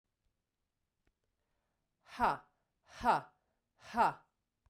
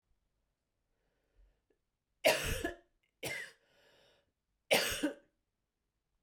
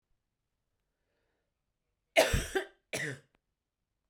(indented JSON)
{
  "exhalation_length": "4.7 s",
  "exhalation_amplitude": 4119,
  "exhalation_signal_mean_std_ratio": 0.27,
  "three_cough_length": "6.2 s",
  "three_cough_amplitude": 6730,
  "three_cough_signal_mean_std_ratio": 0.29,
  "cough_length": "4.1 s",
  "cough_amplitude": 8999,
  "cough_signal_mean_std_ratio": 0.26,
  "survey_phase": "beta (2021-08-13 to 2022-03-07)",
  "age": "45-64",
  "gender": "Female",
  "wearing_mask": "No",
  "symptom_cough_any": true,
  "symptom_runny_or_blocked_nose": true,
  "symptom_headache": true,
  "smoker_status": "Never smoked",
  "respiratory_condition_asthma": false,
  "respiratory_condition_other": false,
  "recruitment_source": "Test and Trace",
  "submission_delay": "2 days",
  "covid_test_result": "Positive",
  "covid_test_method": "RT-qPCR"
}